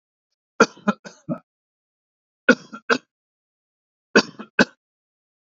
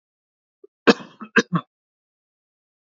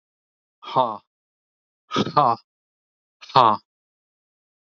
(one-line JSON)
{"three_cough_length": "5.5 s", "three_cough_amplitude": 27896, "three_cough_signal_mean_std_ratio": 0.21, "cough_length": "2.8 s", "cough_amplitude": 29770, "cough_signal_mean_std_ratio": 0.2, "exhalation_length": "4.8 s", "exhalation_amplitude": 27556, "exhalation_signal_mean_std_ratio": 0.28, "survey_phase": "alpha (2021-03-01 to 2021-08-12)", "age": "45-64", "gender": "Male", "wearing_mask": "No", "symptom_none": true, "smoker_status": "Never smoked", "respiratory_condition_asthma": false, "respiratory_condition_other": false, "recruitment_source": "REACT", "submission_delay": "8 days", "covid_test_result": "Negative", "covid_test_method": "RT-qPCR"}